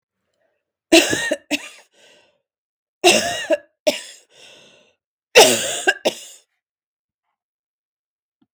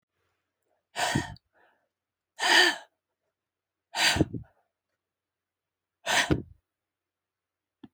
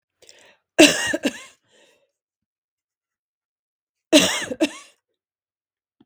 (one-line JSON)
{"three_cough_length": "8.5 s", "three_cough_amplitude": 32766, "three_cough_signal_mean_std_ratio": 0.3, "exhalation_length": "7.9 s", "exhalation_amplitude": 13625, "exhalation_signal_mean_std_ratio": 0.3, "cough_length": "6.1 s", "cough_amplitude": 32768, "cough_signal_mean_std_ratio": 0.25, "survey_phase": "beta (2021-08-13 to 2022-03-07)", "age": "45-64", "gender": "Female", "wearing_mask": "No", "symptom_cough_any": true, "symptom_new_continuous_cough": true, "symptom_runny_or_blocked_nose": true, "symptom_sore_throat": true, "symptom_fatigue": true, "symptom_headache": true, "symptom_change_to_sense_of_smell_or_taste": true, "symptom_loss_of_taste": true, "symptom_onset": "5 days", "smoker_status": "Never smoked", "respiratory_condition_asthma": false, "respiratory_condition_other": false, "recruitment_source": "Test and Trace", "submission_delay": "2 days", "covid_test_result": "Positive", "covid_test_method": "RT-qPCR"}